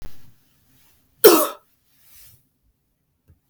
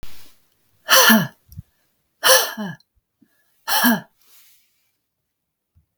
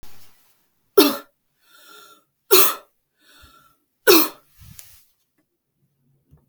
cough_length: 3.5 s
cough_amplitude: 32768
cough_signal_mean_std_ratio: 0.23
exhalation_length: 6.0 s
exhalation_amplitude: 32768
exhalation_signal_mean_std_ratio: 0.35
three_cough_length: 6.5 s
three_cough_amplitude: 32768
three_cough_signal_mean_std_ratio: 0.25
survey_phase: beta (2021-08-13 to 2022-03-07)
age: 18-44
gender: Female
wearing_mask: 'No'
symptom_none: true
smoker_status: Never smoked
respiratory_condition_asthma: false
respiratory_condition_other: false
recruitment_source: REACT
submission_delay: 1 day
covid_test_result: Negative
covid_test_method: RT-qPCR
influenza_a_test_result: Negative
influenza_b_test_result: Negative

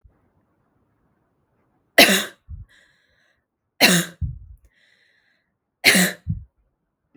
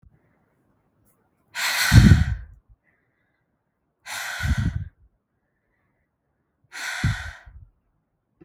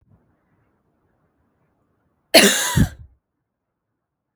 three_cough_length: 7.2 s
three_cough_amplitude: 32768
three_cough_signal_mean_std_ratio: 0.28
exhalation_length: 8.4 s
exhalation_amplitude: 32766
exhalation_signal_mean_std_ratio: 0.29
cough_length: 4.4 s
cough_amplitude: 32768
cough_signal_mean_std_ratio: 0.25
survey_phase: beta (2021-08-13 to 2022-03-07)
age: 18-44
gender: Female
wearing_mask: 'No'
symptom_none: true
smoker_status: Never smoked
respiratory_condition_asthma: false
respiratory_condition_other: false
recruitment_source: Test and Trace
submission_delay: 2 days
covid_test_result: Negative
covid_test_method: ePCR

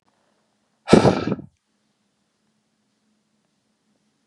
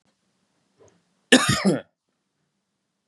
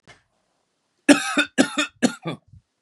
exhalation_length: 4.3 s
exhalation_amplitude: 32768
exhalation_signal_mean_std_ratio: 0.21
cough_length: 3.1 s
cough_amplitude: 30058
cough_signal_mean_std_ratio: 0.27
three_cough_length: 2.8 s
three_cough_amplitude: 32767
three_cough_signal_mean_std_ratio: 0.33
survey_phase: beta (2021-08-13 to 2022-03-07)
age: 45-64
gender: Male
wearing_mask: 'No'
symptom_none: true
smoker_status: Never smoked
respiratory_condition_asthma: false
respiratory_condition_other: false
recruitment_source: REACT
submission_delay: 1 day
covid_test_result: Negative
covid_test_method: RT-qPCR
influenza_a_test_result: Negative
influenza_b_test_result: Negative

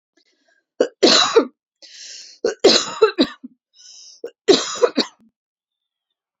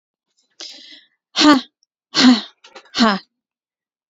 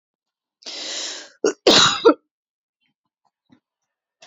three_cough_length: 6.4 s
three_cough_amplitude: 32767
three_cough_signal_mean_std_ratio: 0.36
exhalation_length: 4.1 s
exhalation_amplitude: 30210
exhalation_signal_mean_std_ratio: 0.34
cough_length: 4.3 s
cough_amplitude: 29532
cough_signal_mean_std_ratio: 0.3
survey_phase: beta (2021-08-13 to 2022-03-07)
age: 18-44
gender: Female
wearing_mask: 'No'
symptom_cough_any: true
symptom_runny_or_blocked_nose: true
symptom_fatigue: true
symptom_headache: true
symptom_change_to_sense_of_smell_or_taste: true
smoker_status: Never smoked
respiratory_condition_asthma: false
respiratory_condition_other: false
recruitment_source: Test and Trace
submission_delay: 3 days
covid_test_result: Positive
covid_test_method: RT-qPCR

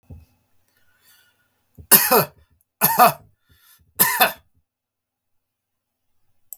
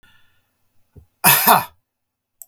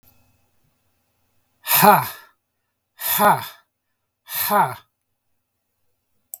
three_cough_length: 6.6 s
three_cough_amplitude: 32768
three_cough_signal_mean_std_ratio: 0.28
cough_length: 2.5 s
cough_amplitude: 32768
cough_signal_mean_std_ratio: 0.31
exhalation_length: 6.4 s
exhalation_amplitude: 32768
exhalation_signal_mean_std_ratio: 0.32
survey_phase: beta (2021-08-13 to 2022-03-07)
age: 45-64
gender: Male
wearing_mask: 'No'
symptom_none: true
smoker_status: Ex-smoker
respiratory_condition_asthma: false
respiratory_condition_other: false
recruitment_source: REACT
submission_delay: 1 day
covid_test_result: Negative
covid_test_method: RT-qPCR
influenza_a_test_result: Negative
influenza_b_test_result: Negative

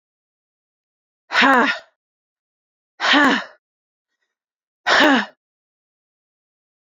exhalation_length: 7.0 s
exhalation_amplitude: 27065
exhalation_signal_mean_std_ratio: 0.33
survey_phase: beta (2021-08-13 to 2022-03-07)
age: 45-64
gender: Female
wearing_mask: 'Yes'
symptom_runny_or_blocked_nose: true
symptom_sore_throat: true
symptom_fatigue: true
symptom_headache: true
symptom_other: true
symptom_onset: 3 days
smoker_status: Never smoked
respiratory_condition_asthma: false
respiratory_condition_other: false
recruitment_source: Test and Trace
submission_delay: 1 day
covid_test_result: Positive
covid_test_method: RT-qPCR
covid_ct_value: 21.8
covid_ct_gene: ORF1ab gene
covid_ct_mean: 22.3
covid_viral_load: 48000 copies/ml
covid_viral_load_category: Low viral load (10K-1M copies/ml)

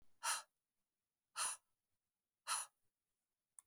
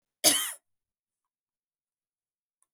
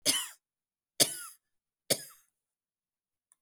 exhalation_length: 3.7 s
exhalation_amplitude: 1460
exhalation_signal_mean_std_ratio: 0.31
cough_length: 2.7 s
cough_amplitude: 14823
cough_signal_mean_std_ratio: 0.21
three_cough_length: 3.4 s
three_cough_amplitude: 13381
three_cough_signal_mean_std_ratio: 0.25
survey_phase: beta (2021-08-13 to 2022-03-07)
age: 45-64
gender: Female
wearing_mask: 'No'
symptom_runny_or_blocked_nose: true
symptom_fatigue: true
symptom_headache: true
symptom_onset: 2 days
smoker_status: Never smoked
respiratory_condition_asthma: false
respiratory_condition_other: false
recruitment_source: Test and Trace
submission_delay: 1 day
covid_test_result: Positive
covid_test_method: RT-qPCR
covid_ct_value: 24.3
covid_ct_gene: ORF1ab gene
covid_ct_mean: 24.9
covid_viral_load: 6900 copies/ml
covid_viral_load_category: Minimal viral load (< 10K copies/ml)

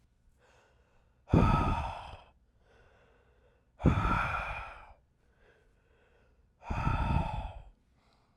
exhalation_length: 8.4 s
exhalation_amplitude: 8845
exhalation_signal_mean_std_ratio: 0.41
survey_phase: alpha (2021-03-01 to 2021-08-12)
age: 18-44
gender: Male
wearing_mask: 'No'
symptom_none: true
smoker_status: Ex-smoker
respiratory_condition_asthma: false
respiratory_condition_other: false
recruitment_source: REACT
submission_delay: 1 day
covid_test_result: Negative
covid_test_method: RT-qPCR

